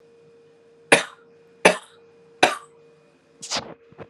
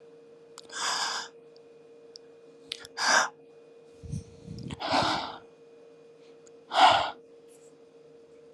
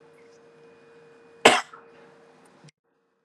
{"three_cough_length": "4.1 s", "three_cough_amplitude": 32768, "three_cough_signal_mean_std_ratio": 0.25, "exhalation_length": "8.5 s", "exhalation_amplitude": 15827, "exhalation_signal_mean_std_ratio": 0.39, "cough_length": "3.2 s", "cough_amplitude": 32366, "cough_signal_mean_std_ratio": 0.19, "survey_phase": "alpha (2021-03-01 to 2021-08-12)", "age": "18-44", "gender": "Male", "wearing_mask": "No", "symptom_none": true, "smoker_status": "Never smoked", "respiratory_condition_asthma": false, "respiratory_condition_other": false, "recruitment_source": "Test and Trace", "submission_delay": "1 day", "covid_test_result": "Positive", "covid_test_method": "RT-qPCR", "covid_ct_value": 21.8, "covid_ct_gene": "ORF1ab gene", "covid_ct_mean": 22.2, "covid_viral_load": "51000 copies/ml", "covid_viral_load_category": "Low viral load (10K-1M copies/ml)"}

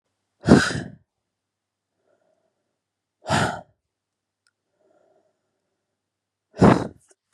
{"exhalation_length": "7.3 s", "exhalation_amplitude": 32768, "exhalation_signal_mean_std_ratio": 0.23, "survey_phase": "beta (2021-08-13 to 2022-03-07)", "age": "18-44", "gender": "Female", "wearing_mask": "No", "symptom_cough_any": true, "symptom_runny_or_blocked_nose": true, "symptom_sore_throat": true, "symptom_abdominal_pain": true, "symptom_fatigue": true, "symptom_headache": true, "smoker_status": "Never smoked", "respiratory_condition_asthma": false, "respiratory_condition_other": false, "recruitment_source": "Test and Trace", "submission_delay": "1 day", "covid_test_result": "Positive", "covid_test_method": "RT-qPCR", "covid_ct_value": 32.4, "covid_ct_gene": "ORF1ab gene", "covid_ct_mean": 33.4, "covid_viral_load": "11 copies/ml", "covid_viral_load_category": "Minimal viral load (< 10K copies/ml)"}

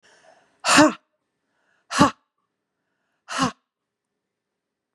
{"exhalation_length": "4.9 s", "exhalation_amplitude": 29196, "exhalation_signal_mean_std_ratio": 0.26, "survey_phase": "beta (2021-08-13 to 2022-03-07)", "age": "45-64", "gender": "Female", "wearing_mask": "No", "symptom_cough_any": true, "symptom_runny_or_blocked_nose": true, "symptom_other": true, "smoker_status": "Current smoker (1 to 10 cigarettes per day)", "respiratory_condition_asthma": true, "respiratory_condition_other": false, "recruitment_source": "Test and Trace", "submission_delay": "1 day", "covid_test_result": "Positive", "covid_test_method": "LFT"}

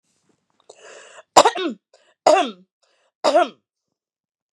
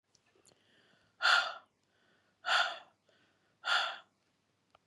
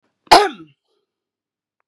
{"three_cough_length": "4.5 s", "three_cough_amplitude": 32768, "three_cough_signal_mean_std_ratio": 0.29, "exhalation_length": "4.9 s", "exhalation_amplitude": 7490, "exhalation_signal_mean_std_ratio": 0.33, "cough_length": "1.9 s", "cough_amplitude": 32768, "cough_signal_mean_std_ratio": 0.23, "survey_phase": "beta (2021-08-13 to 2022-03-07)", "age": "45-64", "gender": "Female", "wearing_mask": "No", "symptom_none": true, "smoker_status": "Ex-smoker", "respiratory_condition_asthma": true, "respiratory_condition_other": false, "recruitment_source": "REACT", "submission_delay": "3 days", "covid_test_result": "Negative", "covid_test_method": "RT-qPCR", "influenza_a_test_result": "Negative", "influenza_b_test_result": "Negative"}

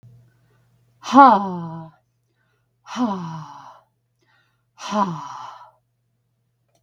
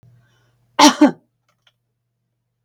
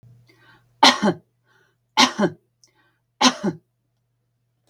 {"exhalation_length": "6.8 s", "exhalation_amplitude": 32768, "exhalation_signal_mean_std_ratio": 0.29, "cough_length": "2.6 s", "cough_amplitude": 32768, "cough_signal_mean_std_ratio": 0.24, "three_cough_length": "4.7 s", "three_cough_amplitude": 32768, "three_cough_signal_mean_std_ratio": 0.29, "survey_phase": "beta (2021-08-13 to 2022-03-07)", "age": "45-64", "gender": "Female", "wearing_mask": "No", "symptom_none": true, "symptom_onset": "2 days", "smoker_status": "Never smoked", "respiratory_condition_asthma": false, "respiratory_condition_other": false, "recruitment_source": "REACT", "submission_delay": "1 day", "covid_test_result": "Negative", "covid_test_method": "RT-qPCR"}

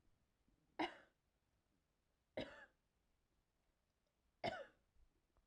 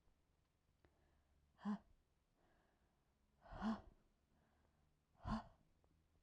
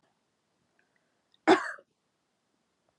{"three_cough_length": "5.5 s", "three_cough_amplitude": 974, "three_cough_signal_mean_std_ratio": 0.25, "exhalation_length": "6.2 s", "exhalation_amplitude": 719, "exhalation_signal_mean_std_ratio": 0.29, "cough_length": "3.0 s", "cough_amplitude": 11877, "cough_signal_mean_std_ratio": 0.18, "survey_phase": "alpha (2021-03-01 to 2021-08-12)", "age": "18-44", "gender": "Female", "wearing_mask": "No", "symptom_none": true, "smoker_status": "Never smoked", "respiratory_condition_asthma": false, "respiratory_condition_other": false, "recruitment_source": "REACT", "submission_delay": "1 day", "covid_test_result": "Negative", "covid_test_method": "RT-qPCR"}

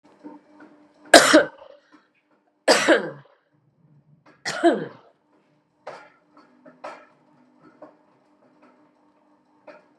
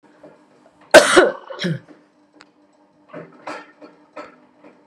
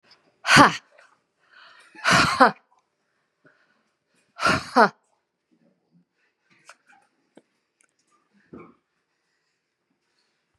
{"three_cough_length": "10.0 s", "three_cough_amplitude": 32768, "three_cough_signal_mean_std_ratio": 0.24, "cough_length": "4.9 s", "cough_amplitude": 32768, "cough_signal_mean_std_ratio": 0.26, "exhalation_length": "10.6 s", "exhalation_amplitude": 32759, "exhalation_signal_mean_std_ratio": 0.23, "survey_phase": "beta (2021-08-13 to 2022-03-07)", "age": "65+", "gender": "Female", "wearing_mask": "No", "symptom_cough_any": true, "symptom_runny_or_blocked_nose": true, "symptom_sore_throat": true, "symptom_headache": true, "symptom_other": true, "symptom_onset": "4 days", "smoker_status": "Ex-smoker", "respiratory_condition_asthma": false, "respiratory_condition_other": false, "recruitment_source": "Test and Trace", "submission_delay": "1 day", "covid_test_result": "Positive", "covid_test_method": "RT-qPCR", "covid_ct_value": 24.9, "covid_ct_gene": "N gene"}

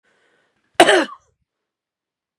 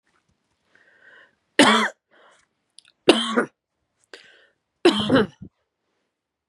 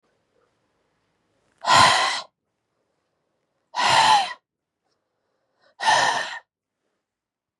{"cough_length": "2.4 s", "cough_amplitude": 32768, "cough_signal_mean_std_ratio": 0.24, "three_cough_length": "6.5 s", "three_cough_amplitude": 32380, "three_cough_signal_mean_std_ratio": 0.3, "exhalation_length": "7.6 s", "exhalation_amplitude": 24890, "exhalation_signal_mean_std_ratio": 0.36, "survey_phase": "beta (2021-08-13 to 2022-03-07)", "age": "18-44", "gender": "Female", "wearing_mask": "No", "symptom_cough_any": true, "symptom_runny_or_blocked_nose": true, "symptom_sore_throat": true, "symptom_fatigue": true, "symptom_headache": true, "symptom_change_to_sense_of_smell_or_taste": true, "symptom_onset": "3 days", "smoker_status": "Ex-smoker", "respiratory_condition_asthma": false, "respiratory_condition_other": false, "recruitment_source": "Test and Trace", "submission_delay": "2 days", "covid_test_result": "Positive", "covid_test_method": "RT-qPCR", "covid_ct_value": 18.4, "covid_ct_gene": "ORF1ab gene", "covid_ct_mean": 19.4, "covid_viral_load": "430000 copies/ml", "covid_viral_load_category": "Low viral load (10K-1M copies/ml)"}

